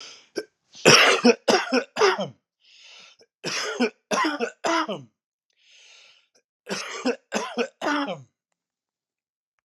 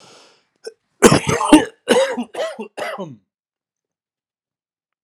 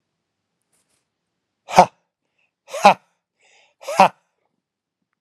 {"three_cough_length": "9.6 s", "three_cough_amplitude": 31372, "three_cough_signal_mean_std_ratio": 0.41, "cough_length": "5.0 s", "cough_amplitude": 32768, "cough_signal_mean_std_ratio": 0.34, "exhalation_length": "5.2 s", "exhalation_amplitude": 32768, "exhalation_signal_mean_std_ratio": 0.18, "survey_phase": "alpha (2021-03-01 to 2021-08-12)", "age": "45-64", "gender": "Male", "wearing_mask": "No", "symptom_cough_any": true, "symptom_fatigue": true, "symptom_headache": true, "smoker_status": "Current smoker (e-cigarettes or vapes only)", "respiratory_condition_asthma": false, "respiratory_condition_other": false, "recruitment_source": "Test and Trace", "submission_delay": "2 days", "covid_test_result": "Positive", "covid_test_method": "RT-qPCR", "covid_ct_value": 24.5, "covid_ct_gene": "N gene", "covid_ct_mean": 24.6, "covid_viral_load": "8800 copies/ml", "covid_viral_load_category": "Minimal viral load (< 10K copies/ml)"}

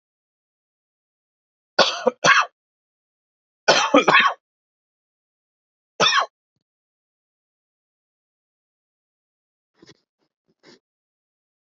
{"cough_length": "11.8 s", "cough_amplitude": 31238, "cough_signal_mean_std_ratio": 0.24, "survey_phase": "beta (2021-08-13 to 2022-03-07)", "age": "18-44", "gender": "Male", "wearing_mask": "No", "symptom_sore_throat": true, "symptom_headache": true, "smoker_status": "Current smoker (e-cigarettes or vapes only)", "respiratory_condition_asthma": false, "respiratory_condition_other": false, "recruitment_source": "Test and Trace", "submission_delay": "1 day", "covid_test_result": "Positive", "covid_test_method": "RT-qPCR", "covid_ct_value": 33.0, "covid_ct_gene": "N gene"}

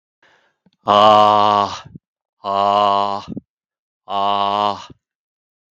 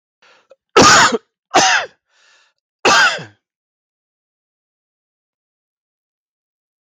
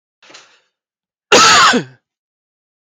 {"exhalation_length": "5.7 s", "exhalation_amplitude": 32766, "exhalation_signal_mean_std_ratio": 0.44, "three_cough_length": "6.8 s", "three_cough_amplitude": 32768, "three_cough_signal_mean_std_ratio": 0.32, "cough_length": "2.8 s", "cough_amplitude": 32768, "cough_signal_mean_std_ratio": 0.37, "survey_phase": "beta (2021-08-13 to 2022-03-07)", "age": "45-64", "gender": "Male", "wearing_mask": "No", "symptom_runny_or_blocked_nose": true, "smoker_status": "Ex-smoker", "respiratory_condition_asthma": false, "respiratory_condition_other": false, "recruitment_source": "REACT", "submission_delay": "9 days", "covid_test_result": "Negative", "covid_test_method": "RT-qPCR", "influenza_a_test_result": "Negative", "influenza_b_test_result": "Negative"}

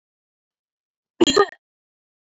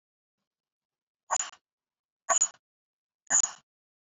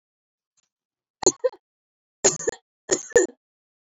{"cough_length": "2.4 s", "cough_amplitude": 23554, "cough_signal_mean_std_ratio": 0.22, "exhalation_length": "4.0 s", "exhalation_amplitude": 8364, "exhalation_signal_mean_std_ratio": 0.25, "three_cough_length": "3.8 s", "three_cough_amplitude": 26197, "three_cough_signal_mean_std_ratio": 0.25, "survey_phase": "beta (2021-08-13 to 2022-03-07)", "age": "18-44", "gender": "Female", "wearing_mask": "No", "symptom_cough_any": true, "symptom_new_continuous_cough": true, "symptom_runny_or_blocked_nose": true, "symptom_shortness_of_breath": true, "symptom_sore_throat": true, "symptom_headache": true, "symptom_onset": "3 days", "smoker_status": "Never smoked", "respiratory_condition_asthma": true, "respiratory_condition_other": false, "recruitment_source": "Test and Trace", "submission_delay": "1 day", "covid_test_result": "Positive", "covid_test_method": "LAMP"}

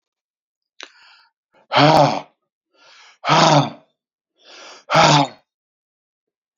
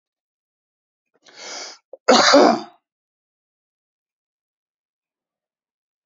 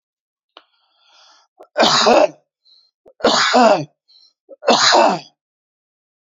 {"exhalation_length": "6.6 s", "exhalation_amplitude": 32768, "exhalation_signal_mean_std_ratio": 0.35, "cough_length": "6.1 s", "cough_amplitude": 32768, "cough_signal_mean_std_ratio": 0.24, "three_cough_length": "6.2 s", "three_cough_amplitude": 30627, "three_cough_signal_mean_std_ratio": 0.43, "survey_phase": "beta (2021-08-13 to 2022-03-07)", "age": "45-64", "gender": "Male", "wearing_mask": "No", "symptom_shortness_of_breath": true, "symptom_fatigue": true, "symptom_headache": true, "symptom_change_to_sense_of_smell_or_taste": true, "smoker_status": "Ex-smoker", "respiratory_condition_asthma": false, "respiratory_condition_other": false, "recruitment_source": "REACT", "submission_delay": "2 days", "covid_test_result": "Negative", "covid_test_method": "RT-qPCR"}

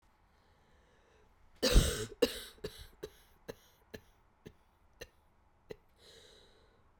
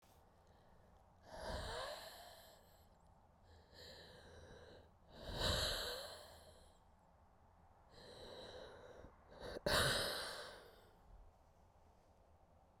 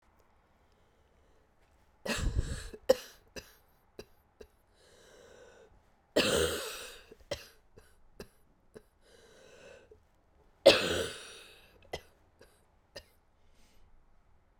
{"cough_length": "7.0 s", "cough_amplitude": 7929, "cough_signal_mean_std_ratio": 0.24, "exhalation_length": "12.8 s", "exhalation_amplitude": 2341, "exhalation_signal_mean_std_ratio": 0.46, "three_cough_length": "14.6 s", "three_cough_amplitude": 15280, "three_cough_signal_mean_std_ratio": 0.26, "survey_phase": "beta (2021-08-13 to 2022-03-07)", "age": "45-64", "gender": "Female", "wearing_mask": "No", "symptom_cough_any": true, "symptom_runny_or_blocked_nose": true, "symptom_sore_throat": true, "symptom_fatigue": true, "symptom_headache": true, "symptom_change_to_sense_of_smell_or_taste": true, "symptom_onset": "2 days", "smoker_status": "Never smoked", "respiratory_condition_asthma": true, "respiratory_condition_other": false, "recruitment_source": "Test and Trace", "submission_delay": "1 day", "covid_test_result": "Positive", "covid_test_method": "RT-qPCR", "covid_ct_value": 17.2, "covid_ct_gene": "ORF1ab gene", "covid_ct_mean": 17.4, "covid_viral_load": "2000000 copies/ml", "covid_viral_load_category": "High viral load (>1M copies/ml)"}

